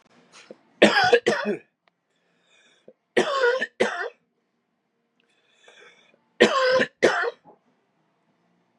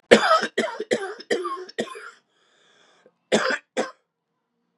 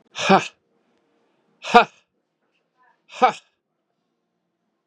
{
  "three_cough_length": "8.8 s",
  "three_cough_amplitude": 30024,
  "three_cough_signal_mean_std_ratio": 0.37,
  "cough_length": "4.8 s",
  "cough_amplitude": 32768,
  "cough_signal_mean_std_ratio": 0.38,
  "exhalation_length": "4.9 s",
  "exhalation_amplitude": 32767,
  "exhalation_signal_mean_std_ratio": 0.22,
  "survey_phase": "beta (2021-08-13 to 2022-03-07)",
  "age": "18-44",
  "gender": "Male",
  "wearing_mask": "No",
  "symptom_cough_any": true,
  "symptom_runny_or_blocked_nose": true,
  "symptom_sore_throat": true,
  "symptom_other": true,
  "smoker_status": "Ex-smoker",
  "respiratory_condition_asthma": false,
  "respiratory_condition_other": false,
  "recruitment_source": "Test and Trace",
  "submission_delay": "2 days",
  "covid_test_result": "Positive",
  "covid_test_method": "LFT"
}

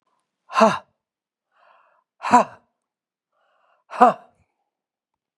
{
  "exhalation_length": "5.4 s",
  "exhalation_amplitude": 32502,
  "exhalation_signal_mean_std_ratio": 0.23,
  "survey_phase": "beta (2021-08-13 to 2022-03-07)",
  "age": "65+",
  "gender": "Female",
  "wearing_mask": "No",
  "symptom_runny_or_blocked_nose": true,
  "symptom_sore_throat": true,
  "smoker_status": "Ex-smoker",
  "respiratory_condition_asthma": true,
  "respiratory_condition_other": true,
  "recruitment_source": "Test and Trace",
  "submission_delay": "3 days",
  "covid_test_result": "Negative",
  "covid_test_method": "ePCR"
}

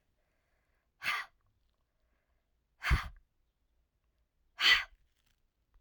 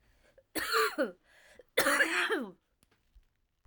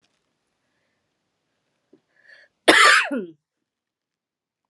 {
  "exhalation_length": "5.8 s",
  "exhalation_amplitude": 7474,
  "exhalation_signal_mean_std_ratio": 0.24,
  "three_cough_length": "3.7 s",
  "three_cough_amplitude": 7579,
  "three_cough_signal_mean_std_ratio": 0.47,
  "cough_length": "4.7 s",
  "cough_amplitude": 32768,
  "cough_signal_mean_std_ratio": 0.25,
  "survey_phase": "alpha (2021-03-01 to 2021-08-12)",
  "age": "45-64",
  "gender": "Female",
  "wearing_mask": "No",
  "symptom_cough_any": true,
  "symptom_diarrhoea": true,
  "symptom_fatigue": true,
  "symptom_fever_high_temperature": true,
  "symptom_change_to_sense_of_smell_or_taste": true,
  "symptom_loss_of_taste": true,
  "smoker_status": "Never smoked",
  "respiratory_condition_asthma": false,
  "respiratory_condition_other": false,
  "recruitment_source": "Test and Trace",
  "submission_delay": "1 day",
  "covid_test_result": "Positive",
  "covid_test_method": "RT-qPCR",
  "covid_ct_value": 20.8,
  "covid_ct_gene": "ORF1ab gene",
  "covid_ct_mean": 21.6,
  "covid_viral_load": "83000 copies/ml",
  "covid_viral_load_category": "Low viral load (10K-1M copies/ml)"
}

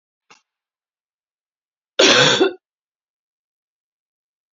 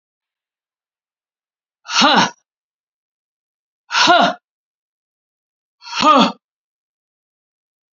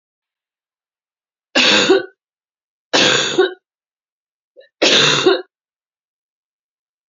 {
  "cough_length": "4.5 s",
  "cough_amplitude": 32767,
  "cough_signal_mean_std_ratio": 0.27,
  "exhalation_length": "7.9 s",
  "exhalation_amplitude": 32768,
  "exhalation_signal_mean_std_ratio": 0.3,
  "three_cough_length": "7.1 s",
  "three_cough_amplitude": 31222,
  "three_cough_signal_mean_std_ratio": 0.39,
  "survey_phase": "beta (2021-08-13 to 2022-03-07)",
  "age": "45-64",
  "gender": "Female",
  "wearing_mask": "No",
  "symptom_cough_any": true,
  "symptom_runny_or_blocked_nose": true,
  "smoker_status": "Never smoked",
  "respiratory_condition_asthma": true,
  "respiratory_condition_other": false,
  "recruitment_source": "Test and Trace",
  "submission_delay": "1 day",
  "covid_test_result": "Positive",
  "covid_test_method": "LFT"
}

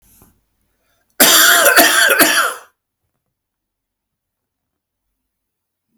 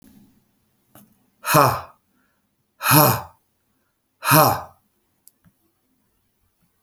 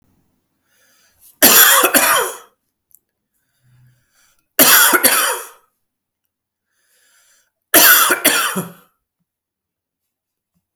{
  "cough_length": "6.0 s",
  "cough_amplitude": 32768,
  "cough_signal_mean_std_ratio": 0.39,
  "exhalation_length": "6.8 s",
  "exhalation_amplitude": 32767,
  "exhalation_signal_mean_std_ratio": 0.3,
  "three_cough_length": "10.8 s",
  "three_cough_amplitude": 32768,
  "three_cough_signal_mean_std_ratio": 0.38,
  "survey_phase": "beta (2021-08-13 to 2022-03-07)",
  "age": "45-64",
  "gender": "Male",
  "wearing_mask": "No",
  "symptom_runny_or_blocked_nose": true,
  "symptom_shortness_of_breath": true,
  "symptom_fatigue": true,
  "symptom_headache": true,
  "symptom_onset": "3 days",
  "smoker_status": "Never smoked",
  "respiratory_condition_asthma": false,
  "respiratory_condition_other": false,
  "recruitment_source": "Test and Trace",
  "submission_delay": "2 days",
  "covid_test_result": "Positive",
  "covid_test_method": "RT-qPCR",
  "covid_ct_value": 29.8,
  "covid_ct_gene": "N gene"
}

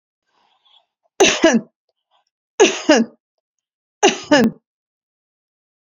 {
  "three_cough_length": "5.9 s",
  "three_cough_amplitude": 32767,
  "three_cough_signal_mean_std_ratio": 0.33,
  "survey_phase": "beta (2021-08-13 to 2022-03-07)",
  "age": "65+",
  "gender": "Female",
  "wearing_mask": "No",
  "symptom_runny_or_blocked_nose": true,
  "symptom_shortness_of_breath": true,
  "symptom_onset": "6 days",
  "smoker_status": "Ex-smoker",
  "respiratory_condition_asthma": false,
  "respiratory_condition_other": false,
  "recruitment_source": "Test and Trace",
  "submission_delay": "2 days",
  "covid_test_result": "Positive",
  "covid_test_method": "ePCR"
}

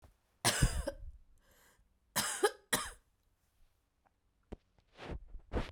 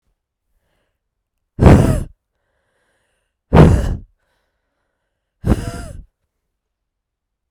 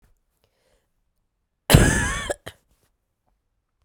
{
  "three_cough_length": "5.7 s",
  "three_cough_amplitude": 6094,
  "three_cough_signal_mean_std_ratio": 0.36,
  "exhalation_length": "7.5 s",
  "exhalation_amplitude": 32768,
  "exhalation_signal_mean_std_ratio": 0.28,
  "cough_length": "3.8 s",
  "cough_amplitude": 32767,
  "cough_signal_mean_std_ratio": 0.26,
  "survey_phase": "beta (2021-08-13 to 2022-03-07)",
  "age": "45-64",
  "gender": "Female",
  "wearing_mask": "No",
  "symptom_cough_any": true,
  "symptom_runny_or_blocked_nose": true,
  "symptom_fatigue": true,
  "symptom_fever_high_temperature": true,
  "symptom_headache": true,
  "smoker_status": "Ex-smoker",
  "respiratory_condition_asthma": false,
  "respiratory_condition_other": false,
  "recruitment_source": "Test and Trace",
  "submission_delay": "2 days",
  "covid_test_result": "Positive",
  "covid_test_method": "RT-qPCR",
  "covid_ct_value": 20.0,
  "covid_ct_gene": "ORF1ab gene"
}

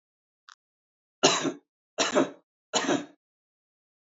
{
  "three_cough_length": "4.0 s",
  "three_cough_amplitude": 17764,
  "three_cough_signal_mean_std_ratio": 0.34,
  "survey_phase": "alpha (2021-03-01 to 2021-08-12)",
  "age": "45-64",
  "gender": "Male",
  "wearing_mask": "No",
  "symptom_none": true,
  "symptom_onset": "2 days",
  "smoker_status": "Never smoked",
  "respiratory_condition_asthma": false,
  "respiratory_condition_other": false,
  "recruitment_source": "REACT",
  "submission_delay": "1 day",
  "covid_test_result": "Negative",
  "covid_test_method": "RT-qPCR"
}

